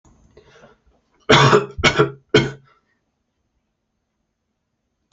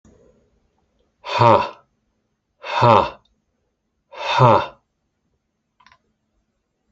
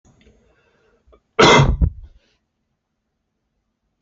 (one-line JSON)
{"three_cough_length": "5.1 s", "three_cough_amplitude": 28570, "three_cough_signal_mean_std_ratio": 0.3, "exhalation_length": "6.9 s", "exhalation_amplitude": 29438, "exhalation_signal_mean_std_ratio": 0.31, "cough_length": "4.0 s", "cough_amplitude": 29469, "cough_signal_mean_std_ratio": 0.28, "survey_phase": "beta (2021-08-13 to 2022-03-07)", "age": "18-44", "gender": "Male", "wearing_mask": "No", "symptom_cough_any": true, "symptom_runny_or_blocked_nose": true, "symptom_other": true, "symptom_onset": "6 days", "smoker_status": "Never smoked", "respiratory_condition_asthma": false, "respiratory_condition_other": false, "recruitment_source": "REACT", "submission_delay": "1 day", "covid_test_result": "Negative", "covid_test_method": "RT-qPCR"}